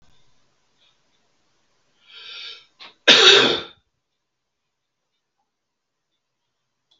{
  "cough_length": "7.0 s",
  "cough_amplitude": 32768,
  "cough_signal_mean_std_ratio": 0.22,
  "survey_phase": "beta (2021-08-13 to 2022-03-07)",
  "age": "65+",
  "gender": "Male",
  "wearing_mask": "No",
  "symptom_cough_any": true,
  "symptom_runny_or_blocked_nose": true,
  "symptom_sore_throat": true,
  "symptom_onset": "8 days",
  "smoker_status": "Never smoked",
  "respiratory_condition_asthma": false,
  "respiratory_condition_other": false,
  "recruitment_source": "REACT",
  "submission_delay": "1 day",
  "covid_test_result": "Negative",
  "covid_test_method": "RT-qPCR",
  "influenza_a_test_result": "Negative",
  "influenza_b_test_result": "Negative"
}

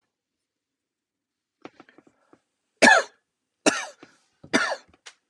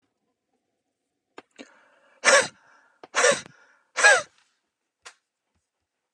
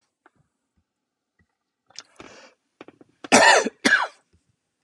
{
  "three_cough_length": "5.3 s",
  "three_cough_amplitude": 27011,
  "three_cough_signal_mean_std_ratio": 0.23,
  "exhalation_length": "6.1 s",
  "exhalation_amplitude": 23273,
  "exhalation_signal_mean_std_ratio": 0.26,
  "cough_length": "4.8 s",
  "cough_amplitude": 30755,
  "cough_signal_mean_std_ratio": 0.27,
  "survey_phase": "beta (2021-08-13 to 2022-03-07)",
  "age": "45-64",
  "gender": "Male",
  "wearing_mask": "No",
  "symptom_none": true,
  "smoker_status": "Ex-smoker",
  "respiratory_condition_asthma": false,
  "respiratory_condition_other": false,
  "recruitment_source": "REACT",
  "submission_delay": "1 day",
  "covid_test_result": "Negative",
  "covid_test_method": "RT-qPCR",
  "influenza_a_test_result": "Negative",
  "influenza_b_test_result": "Negative"
}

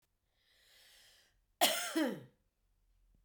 {
  "cough_length": "3.2 s",
  "cough_amplitude": 6212,
  "cough_signal_mean_std_ratio": 0.32,
  "survey_phase": "beta (2021-08-13 to 2022-03-07)",
  "age": "45-64",
  "gender": "Female",
  "wearing_mask": "No",
  "symptom_none": true,
  "smoker_status": "Never smoked",
  "respiratory_condition_asthma": false,
  "respiratory_condition_other": false,
  "recruitment_source": "REACT",
  "submission_delay": "2 days",
  "covid_test_result": "Negative",
  "covid_test_method": "RT-qPCR"
}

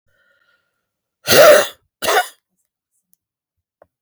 {
  "cough_length": "4.0 s",
  "cough_amplitude": 32768,
  "cough_signal_mean_std_ratio": 0.3,
  "survey_phase": "beta (2021-08-13 to 2022-03-07)",
  "age": "45-64",
  "gender": "Male",
  "wearing_mask": "No",
  "symptom_none": true,
  "smoker_status": "Never smoked",
  "respiratory_condition_asthma": false,
  "respiratory_condition_other": false,
  "recruitment_source": "REACT",
  "submission_delay": "2 days",
  "covid_test_result": "Negative",
  "covid_test_method": "RT-qPCR",
  "influenza_a_test_result": "Negative",
  "influenza_b_test_result": "Negative"
}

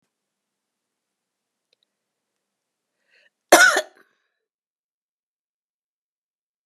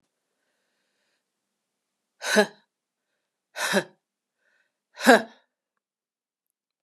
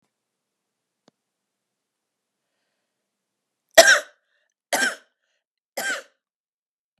{
  "cough_length": "6.7 s",
  "cough_amplitude": 32768,
  "cough_signal_mean_std_ratio": 0.16,
  "exhalation_length": "6.8 s",
  "exhalation_amplitude": 31754,
  "exhalation_signal_mean_std_ratio": 0.2,
  "three_cough_length": "7.0 s",
  "three_cough_amplitude": 32768,
  "three_cough_signal_mean_std_ratio": 0.19,
  "survey_phase": "beta (2021-08-13 to 2022-03-07)",
  "age": "45-64",
  "gender": "Female",
  "wearing_mask": "No",
  "symptom_none": true,
  "smoker_status": "Never smoked",
  "respiratory_condition_asthma": false,
  "respiratory_condition_other": false,
  "recruitment_source": "REACT",
  "submission_delay": "1 day",
  "covid_test_result": "Negative",
  "covid_test_method": "RT-qPCR"
}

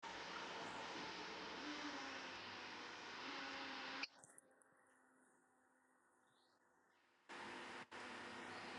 {
  "exhalation_length": "8.8 s",
  "exhalation_amplitude": 775,
  "exhalation_signal_mean_std_ratio": 0.83,
  "survey_phase": "alpha (2021-03-01 to 2021-08-12)",
  "age": "18-44",
  "gender": "Female",
  "wearing_mask": "No",
  "symptom_headache": true,
  "smoker_status": "Current smoker (1 to 10 cigarettes per day)",
  "respiratory_condition_asthma": false,
  "respiratory_condition_other": false,
  "recruitment_source": "Test and Trace",
  "submission_delay": "2 days",
  "covid_test_result": "Positive",
  "covid_test_method": "RT-qPCR",
  "covid_ct_value": 17.3,
  "covid_ct_gene": "ORF1ab gene",
  "covid_ct_mean": 17.9,
  "covid_viral_load": "1400000 copies/ml",
  "covid_viral_load_category": "High viral load (>1M copies/ml)"
}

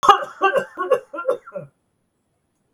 {
  "cough_length": "2.7 s",
  "cough_amplitude": 32768,
  "cough_signal_mean_std_ratio": 0.39,
  "survey_phase": "beta (2021-08-13 to 2022-03-07)",
  "age": "65+",
  "gender": "Male",
  "wearing_mask": "No",
  "symptom_none": true,
  "smoker_status": "Ex-smoker",
  "respiratory_condition_asthma": false,
  "respiratory_condition_other": false,
  "recruitment_source": "REACT",
  "submission_delay": "3 days",
  "covid_test_result": "Negative",
  "covid_test_method": "RT-qPCR",
  "influenza_a_test_result": "Negative",
  "influenza_b_test_result": "Negative"
}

